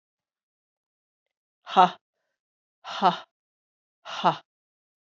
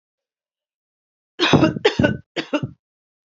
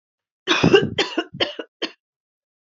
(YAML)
exhalation_length: 5.0 s
exhalation_amplitude: 20920
exhalation_signal_mean_std_ratio: 0.22
three_cough_length: 3.3 s
three_cough_amplitude: 27861
three_cough_signal_mean_std_ratio: 0.36
cough_length: 2.7 s
cough_amplitude: 26776
cough_signal_mean_std_ratio: 0.39
survey_phase: alpha (2021-03-01 to 2021-08-12)
age: 45-64
gender: Female
wearing_mask: 'No'
symptom_cough_any: true
symptom_fatigue: true
symptom_headache: true
symptom_onset: 3 days
smoker_status: Never smoked
respiratory_condition_asthma: false
respiratory_condition_other: false
recruitment_source: Test and Trace
submission_delay: 2 days
covid_test_result: Positive
covid_test_method: RT-qPCR
covid_ct_value: 26.3
covid_ct_gene: ORF1ab gene